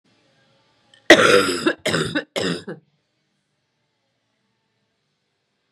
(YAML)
three_cough_length: 5.7 s
three_cough_amplitude: 32768
three_cough_signal_mean_std_ratio: 0.3
survey_phase: beta (2021-08-13 to 2022-03-07)
age: 18-44
gender: Female
wearing_mask: 'No'
symptom_cough_any: true
symptom_runny_or_blocked_nose: true
symptom_change_to_sense_of_smell_or_taste: true
symptom_loss_of_taste: true
symptom_onset: 7 days
smoker_status: Never smoked
respiratory_condition_asthma: false
respiratory_condition_other: false
recruitment_source: Test and Trace
submission_delay: 1 day
covid_test_result: Positive
covid_test_method: RT-qPCR